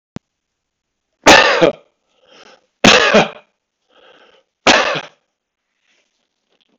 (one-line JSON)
{"three_cough_length": "6.8 s", "three_cough_amplitude": 32768, "three_cough_signal_mean_std_ratio": 0.33, "survey_phase": "beta (2021-08-13 to 2022-03-07)", "age": "65+", "gender": "Male", "wearing_mask": "No", "symptom_runny_or_blocked_nose": true, "symptom_fatigue": true, "symptom_onset": "4 days", "smoker_status": "Never smoked", "respiratory_condition_asthma": false, "respiratory_condition_other": false, "recruitment_source": "REACT", "submission_delay": "0 days", "covid_test_result": "Negative", "covid_test_method": "RT-qPCR", "influenza_a_test_result": "Unknown/Void", "influenza_b_test_result": "Unknown/Void"}